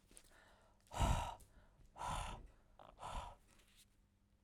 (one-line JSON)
{"exhalation_length": "4.4 s", "exhalation_amplitude": 1769, "exhalation_signal_mean_std_ratio": 0.42, "survey_phase": "alpha (2021-03-01 to 2021-08-12)", "age": "45-64", "gender": "Female", "wearing_mask": "No", "symptom_none": true, "symptom_onset": "8 days", "smoker_status": "Ex-smoker", "respiratory_condition_asthma": false, "respiratory_condition_other": false, "recruitment_source": "REACT", "submission_delay": "4 days", "covid_test_result": "Negative", "covid_test_method": "RT-qPCR"}